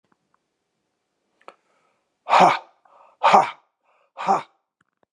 {
  "exhalation_length": "5.1 s",
  "exhalation_amplitude": 30802,
  "exhalation_signal_mean_std_ratio": 0.28,
  "survey_phase": "beta (2021-08-13 to 2022-03-07)",
  "age": "45-64",
  "gender": "Male",
  "wearing_mask": "No",
  "symptom_cough_any": true,
  "symptom_sore_throat": true,
  "symptom_headache": true,
  "symptom_onset": "8 days",
  "smoker_status": "Never smoked",
  "respiratory_condition_asthma": false,
  "respiratory_condition_other": false,
  "recruitment_source": "Test and Trace",
  "submission_delay": "1 day",
  "covid_test_result": "Positive",
  "covid_test_method": "RT-qPCR",
  "covid_ct_value": 16.1,
  "covid_ct_gene": "ORF1ab gene"
}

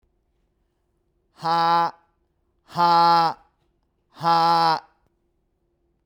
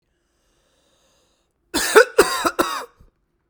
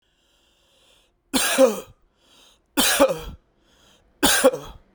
{
  "exhalation_length": "6.1 s",
  "exhalation_amplitude": 16324,
  "exhalation_signal_mean_std_ratio": 0.45,
  "cough_length": "3.5 s",
  "cough_amplitude": 32768,
  "cough_signal_mean_std_ratio": 0.3,
  "three_cough_length": "4.9 s",
  "three_cough_amplitude": 26707,
  "three_cough_signal_mean_std_ratio": 0.39,
  "survey_phase": "beta (2021-08-13 to 2022-03-07)",
  "age": "18-44",
  "gender": "Male",
  "wearing_mask": "No",
  "symptom_none": true,
  "smoker_status": "Ex-smoker",
  "respiratory_condition_asthma": false,
  "respiratory_condition_other": false,
  "recruitment_source": "REACT",
  "submission_delay": "1 day",
  "covid_test_method": "RT-qPCR"
}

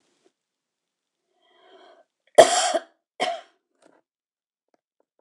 {
  "cough_length": "5.2 s",
  "cough_amplitude": 26028,
  "cough_signal_mean_std_ratio": 0.2,
  "survey_phase": "alpha (2021-03-01 to 2021-08-12)",
  "age": "65+",
  "gender": "Female",
  "wearing_mask": "No",
  "symptom_none": true,
  "smoker_status": "Never smoked",
  "respiratory_condition_asthma": false,
  "respiratory_condition_other": false,
  "recruitment_source": "REACT",
  "submission_delay": "1 day",
  "covid_test_result": "Negative",
  "covid_test_method": "RT-qPCR"
}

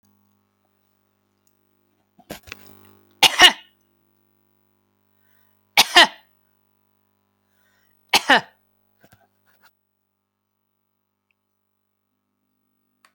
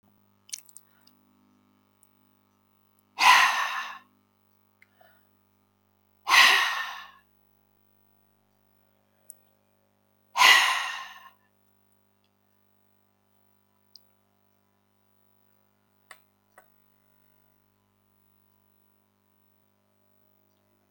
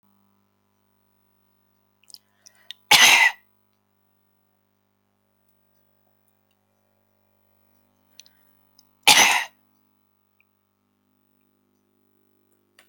{
  "three_cough_length": "13.1 s",
  "three_cough_amplitude": 32768,
  "three_cough_signal_mean_std_ratio": 0.16,
  "exhalation_length": "20.9 s",
  "exhalation_amplitude": 22079,
  "exhalation_signal_mean_std_ratio": 0.22,
  "cough_length": "12.9 s",
  "cough_amplitude": 32768,
  "cough_signal_mean_std_ratio": 0.19,
  "survey_phase": "beta (2021-08-13 to 2022-03-07)",
  "age": "65+",
  "gender": "Female",
  "wearing_mask": "No",
  "symptom_shortness_of_breath": true,
  "symptom_abdominal_pain": true,
  "symptom_fatigue": true,
  "smoker_status": "Ex-smoker",
  "respiratory_condition_asthma": false,
  "respiratory_condition_other": true,
  "recruitment_source": "REACT",
  "submission_delay": "2 days",
  "covid_test_result": "Negative",
  "covid_test_method": "RT-qPCR",
  "influenza_a_test_result": "Negative",
  "influenza_b_test_result": "Negative"
}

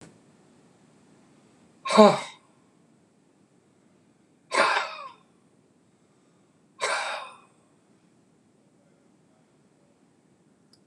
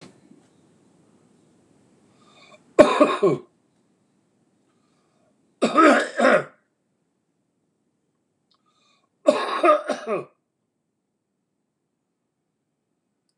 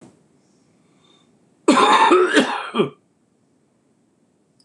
{
  "exhalation_length": "10.9 s",
  "exhalation_amplitude": 25893,
  "exhalation_signal_mean_std_ratio": 0.22,
  "three_cough_length": "13.4 s",
  "three_cough_amplitude": 26028,
  "three_cough_signal_mean_std_ratio": 0.28,
  "cough_length": "4.6 s",
  "cough_amplitude": 26027,
  "cough_signal_mean_std_ratio": 0.39,
  "survey_phase": "beta (2021-08-13 to 2022-03-07)",
  "age": "65+",
  "gender": "Male",
  "wearing_mask": "No",
  "symptom_none": true,
  "smoker_status": "Ex-smoker",
  "respiratory_condition_asthma": true,
  "respiratory_condition_other": true,
  "recruitment_source": "REACT",
  "submission_delay": "1 day",
  "covid_test_result": "Negative",
  "covid_test_method": "RT-qPCR"
}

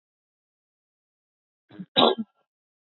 {
  "cough_length": "3.0 s",
  "cough_amplitude": 25746,
  "cough_signal_mean_std_ratio": 0.2,
  "survey_phase": "beta (2021-08-13 to 2022-03-07)",
  "age": "18-44",
  "gender": "Female",
  "wearing_mask": "No",
  "symptom_none": true,
  "smoker_status": "Never smoked",
  "respiratory_condition_asthma": false,
  "respiratory_condition_other": false,
  "recruitment_source": "REACT",
  "submission_delay": "6 days",
  "covid_test_result": "Negative",
  "covid_test_method": "RT-qPCR",
  "influenza_a_test_result": "Negative",
  "influenza_b_test_result": "Negative"
}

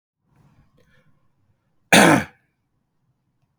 {
  "three_cough_length": "3.6 s",
  "three_cough_amplitude": 32768,
  "three_cough_signal_mean_std_ratio": 0.23,
  "survey_phase": "beta (2021-08-13 to 2022-03-07)",
  "age": "18-44",
  "gender": "Male",
  "wearing_mask": "No",
  "symptom_none": true,
  "smoker_status": "Never smoked",
  "respiratory_condition_asthma": false,
  "respiratory_condition_other": false,
  "recruitment_source": "REACT",
  "submission_delay": "1 day",
  "covid_test_result": "Negative",
  "covid_test_method": "RT-qPCR",
  "influenza_a_test_result": "Negative",
  "influenza_b_test_result": "Negative"
}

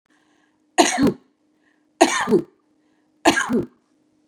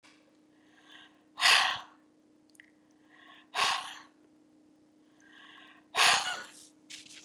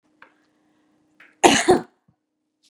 {
  "three_cough_length": "4.3 s",
  "three_cough_amplitude": 32768,
  "three_cough_signal_mean_std_ratio": 0.37,
  "exhalation_length": "7.2 s",
  "exhalation_amplitude": 10570,
  "exhalation_signal_mean_std_ratio": 0.32,
  "cough_length": "2.7 s",
  "cough_amplitude": 32767,
  "cough_signal_mean_std_ratio": 0.26,
  "survey_phase": "beta (2021-08-13 to 2022-03-07)",
  "age": "65+",
  "gender": "Female",
  "wearing_mask": "No",
  "symptom_none": true,
  "smoker_status": "Never smoked",
  "respiratory_condition_asthma": false,
  "respiratory_condition_other": false,
  "recruitment_source": "REACT",
  "submission_delay": "1 day",
  "covid_test_result": "Negative",
  "covid_test_method": "RT-qPCR",
  "influenza_a_test_result": "Negative",
  "influenza_b_test_result": "Negative"
}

